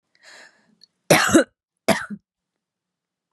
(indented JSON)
{
  "cough_length": "3.3 s",
  "cough_amplitude": 32668,
  "cough_signal_mean_std_ratio": 0.28,
  "survey_phase": "beta (2021-08-13 to 2022-03-07)",
  "age": "45-64",
  "gender": "Female",
  "wearing_mask": "No",
  "symptom_cough_any": true,
  "symptom_runny_or_blocked_nose": true,
  "symptom_sore_throat": true,
  "symptom_fever_high_temperature": true,
  "smoker_status": "Never smoked",
  "recruitment_source": "Test and Trace",
  "submission_delay": "2 days",
  "covid_test_result": "Positive",
  "covid_test_method": "LFT"
}